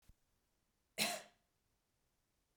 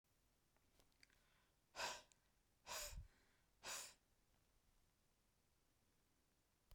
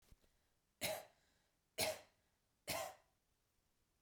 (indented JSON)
{
  "cough_length": "2.6 s",
  "cough_amplitude": 2851,
  "cough_signal_mean_std_ratio": 0.24,
  "exhalation_length": "6.7 s",
  "exhalation_amplitude": 579,
  "exhalation_signal_mean_std_ratio": 0.36,
  "three_cough_length": "4.0 s",
  "three_cough_amplitude": 1691,
  "three_cough_signal_mean_std_ratio": 0.33,
  "survey_phase": "beta (2021-08-13 to 2022-03-07)",
  "age": "45-64",
  "gender": "Female",
  "wearing_mask": "No",
  "symptom_none": true,
  "smoker_status": "Never smoked",
  "respiratory_condition_asthma": false,
  "respiratory_condition_other": false,
  "recruitment_source": "REACT",
  "submission_delay": "1 day",
  "covid_test_result": "Negative",
  "covid_test_method": "RT-qPCR",
  "influenza_a_test_result": "Negative",
  "influenza_b_test_result": "Negative"
}